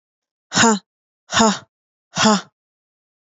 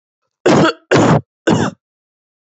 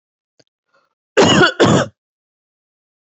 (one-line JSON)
{"exhalation_length": "3.3 s", "exhalation_amplitude": 29332, "exhalation_signal_mean_std_ratio": 0.35, "three_cough_length": "2.6 s", "three_cough_amplitude": 32050, "three_cough_signal_mean_std_ratio": 0.48, "cough_length": "3.2 s", "cough_amplitude": 29170, "cough_signal_mean_std_ratio": 0.37, "survey_phase": "beta (2021-08-13 to 2022-03-07)", "age": "18-44", "gender": "Female", "wearing_mask": "No", "symptom_none": true, "smoker_status": "Never smoked", "respiratory_condition_asthma": false, "respiratory_condition_other": false, "recruitment_source": "REACT", "submission_delay": "3 days", "covid_test_result": "Negative", "covid_test_method": "RT-qPCR", "influenza_a_test_result": "Negative", "influenza_b_test_result": "Negative"}